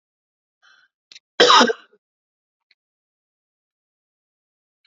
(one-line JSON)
{"cough_length": "4.9 s", "cough_amplitude": 28881, "cough_signal_mean_std_ratio": 0.21, "survey_phase": "beta (2021-08-13 to 2022-03-07)", "age": "45-64", "gender": "Female", "wearing_mask": "No", "symptom_runny_or_blocked_nose": true, "symptom_fatigue": true, "symptom_headache": true, "smoker_status": "Never smoked", "respiratory_condition_asthma": false, "respiratory_condition_other": false, "recruitment_source": "Test and Trace", "submission_delay": "2 days", "covid_test_result": "Positive", "covid_test_method": "RT-qPCR", "covid_ct_value": 22.0, "covid_ct_gene": "ORF1ab gene"}